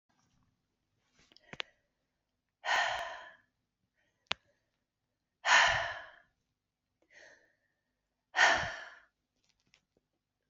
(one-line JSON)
{"exhalation_length": "10.5 s", "exhalation_amplitude": 10748, "exhalation_signal_mean_std_ratio": 0.27, "survey_phase": "beta (2021-08-13 to 2022-03-07)", "age": "45-64", "gender": "Female", "wearing_mask": "No", "symptom_runny_or_blocked_nose": true, "symptom_shortness_of_breath": true, "symptom_sore_throat": true, "symptom_fatigue": true, "symptom_fever_high_temperature": true, "symptom_headache": true, "symptom_onset": "6 days", "smoker_status": "Never smoked", "respiratory_condition_asthma": false, "respiratory_condition_other": false, "recruitment_source": "Test and Trace", "submission_delay": "2 days", "covid_test_result": "Positive", "covid_test_method": "LAMP"}